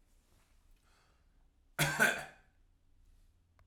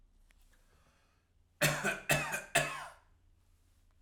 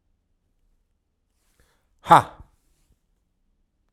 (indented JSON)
{
  "cough_length": "3.7 s",
  "cough_amplitude": 5255,
  "cough_signal_mean_std_ratio": 0.28,
  "three_cough_length": "4.0 s",
  "three_cough_amplitude": 7592,
  "three_cough_signal_mean_std_ratio": 0.38,
  "exhalation_length": "3.9 s",
  "exhalation_amplitude": 32768,
  "exhalation_signal_mean_std_ratio": 0.14,
  "survey_phase": "beta (2021-08-13 to 2022-03-07)",
  "age": "18-44",
  "gender": "Male",
  "wearing_mask": "No",
  "symptom_none": true,
  "smoker_status": "Ex-smoker",
  "respiratory_condition_asthma": false,
  "respiratory_condition_other": false,
  "recruitment_source": "REACT",
  "submission_delay": "0 days",
  "covid_test_result": "Negative",
  "covid_test_method": "RT-qPCR"
}